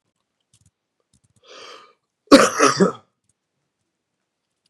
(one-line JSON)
{"cough_length": "4.7 s", "cough_amplitude": 32768, "cough_signal_mean_std_ratio": 0.24, "survey_phase": "beta (2021-08-13 to 2022-03-07)", "age": "45-64", "gender": "Male", "wearing_mask": "No", "symptom_cough_any": true, "symptom_runny_or_blocked_nose": true, "symptom_sore_throat": true, "symptom_fatigue": true, "symptom_fever_high_temperature": true, "symptom_headache": true, "symptom_onset": "4 days", "smoker_status": "Ex-smoker", "respiratory_condition_asthma": false, "respiratory_condition_other": false, "recruitment_source": "Test and Trace", "submission_delay": "2 days", "covid_test_result": "Positive", "covid_test_method": "RT-qPCR", "covid_ct_value": 17.6, "covid_ct_gene": "ORF1ab gene", "covid_ct_mean": 17.8, "covid_viral_load": "1500000 copies/ml", "covid_viral_load_category": "High viral load (>1M copies/ml)"}